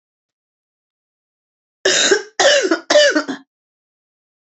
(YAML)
cough_length: 4.4 s
cough_amplitude: 31834
cough_signal_mean_std_ratio: 0.41
survey_phase: alpha (2021-03-01 to 2021-08-12)
age: 65+
gender: Female
wearing_mask: 'No'
symptom_cough_any: true
symptom_fatigue: true
symptom_headache: true
smoker_status: Ex-smoker
respiratory_condition_asthma: true
respiratory_condition_other: false
recruitment_source: Test and Trace
submission_delay: 2 days
covid_test_result: Positive
covid_test_method: RT-qPCR
covid_ct_value: 21.9
covid_ct_gene: ORF1ab gene
covid_ct_mean: 22.8
covid_viral_load: 32000 copies/ml
covid_viral_load_category: Low viral load (10K-1M copies/ml)